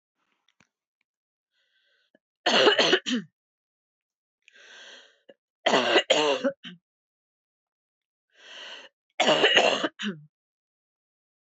{"three_cough_length": "11.4 s", "three_cough_amplitude": 19674, "three_cough_signal_mean_std_ratio": 0.35, "survey_phase": "beta (2021-08-13 to 2022-03-07)", "age": "45-64", "gender": "Female", "wearing_mask": "No", "symptom_runny_or_blocked_nose": true, "smoker_status": "Never smoked", "respiratory_condition_asthma": false, "respiratory_condition_other": false, "recruitment_source": "REACT", "submission_delay": "1 day", "covid_test_result": "Negative", "covid_test_method": "RT-qPCR", "influenza_a_test_result": "Negative", "influenza_b_test_result": "Negative"}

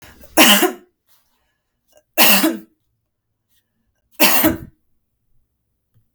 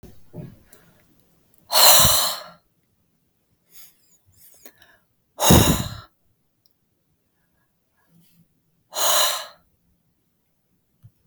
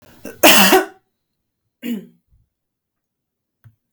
{"three_cough_length": "6.1 s", "three_cough_amplitude": 32768, "three_cough_signal_mean_std_ratio": 0.35, "exhalation_length": "11.3 s", "exhalation_amplitude": 32768, "exhalation_signal_mean_std_ratio": 0.29, "cough_length": "3.9 s", "cough_amplitude": 32768, "cough_signal_mean_std_ratio": 0.3, "survey_phase": "beta (2021-08-13 to 2022-03-07)", "age": "45-64", "gender": "Female", "wearing_mask": "No", "symptom_none": true, "smoker_status": "Ex-smoker", "respiratory_condition_asthma": false, "respiratory_condition_other": false, "recruitment_source": "REACT", "submission_delay": "2 days", "covid_test_result": "Negative", "covid_test_method": "RT-qPCR", "influenza_a_test_result": "Negative", "influenza_b_test_result": "Negative"}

